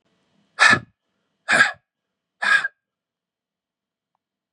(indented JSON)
{
  "exhalation_length": "4.5 s",
  "exhalation_amplitude": 28810,
  "exhalation_signal_mean_std_ratio": 0.29,
  "survey_phase": "beta (2021-08-13 to 2022-03-07)",
  "age": "18-44",
  "gender": "Male",
  "wearing_mask": "No",
  "symptom_cough_any": true,
  "symptom_runny_or_blocked_nose": true,
  "symptom_shortness_of_breath": true,
  "symptom_fatigue": true,
  "symptom_headache": true,
  "symptom_change_to_sense_of_smell_or_taste": true,
  "symptom_loss_of_taste": true,
  "smoker_status": "Ex-smoker",
  "respiratory_condition_asthma": false,
  "respiratory_condition_other": false,
  "recruitment_source": "Test and Trace",
  "submission_delay": "2 days",
  "covid_test_result": "Positive",
  "covid_test_method": "LFT"
}